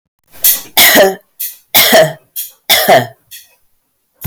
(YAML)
three_cough_length: 4.3 s
three_cough_amplitude: 32768
three_cough_signal_mean_std_ratio: 0.52
survey_phase: beta (2021-08-13 to 2022-03-07)
age: 45-64
gender: Female
wearing_mask: 'No'
symptom_cough_any: true
symptom_runny_or_blocked_nose: true
smoker_status: Ex-smoker
respiratory_condition_asthma: false
respiratory_condition_other: false
recruitment_source: Test and Trace
submission_delay: 1 day
covid_test_result: Positive
covid_test_method: RT-qPCR
covid_ct_value: 28.5
covid_ct_gene: ORF1ab gene
covid_ct_mean: 29.0
covid_viral_load: 310 copies/ml
covid_viral_load_category: Minimal viral load (< 10K copies/ml)